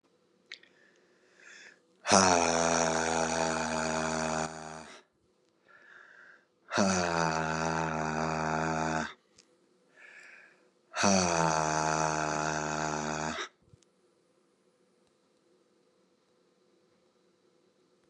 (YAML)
exhalation_length: 18.1 s
exhalation_amplitude: 17581
exhalation_signal_mean_std_ratio: 0.51
survey_phase: beta (2021-08-13 to 2022-03-07)
age: 18-44
gender: Male
wearing_mask: 'No'
symptom_cough_any: true
symptom_sore_throat: true
symptom_fatigue: true
symptom_headache: true
symptom_onset: 2 days
smoker_status: Never smoked
respiratory_condition_asthma: false
respiratory_condition_other: false
recruitment_source: Test and Trace
submission_delay: 1 day
covid_test_result: Positive
covid_test_method: ePCR